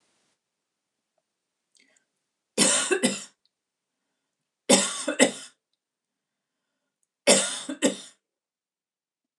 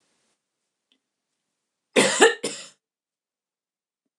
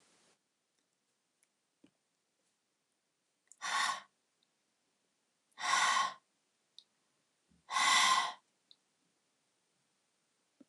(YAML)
three_cough_length: 9.4 s
three_cough_amplitude: 24616
three_cough_signal_mean_std_ratio: 0.29
cough_length: 4.2 s
cough_amplitude: 28907
cough_signal_mean_std_ratio: 0.23
exhalation_length: 10.7 s
exhalation_amplitude: 4691
exhalation_signal_mean_std_ratio: 0.3
survey_phase: beta (2021-08-13 to 2022-03-07)
age: 45-64
gender: Female
wearing_mask: 'No'
symptom_none: true
smoker_status: Never smoked
respiratory_condition_asthma: false
respiratory_condition_other: false
recruitment_source: REACT
submission_delay: 2 days
covid_test_result: Negative
covid_test_method: RT-qPCR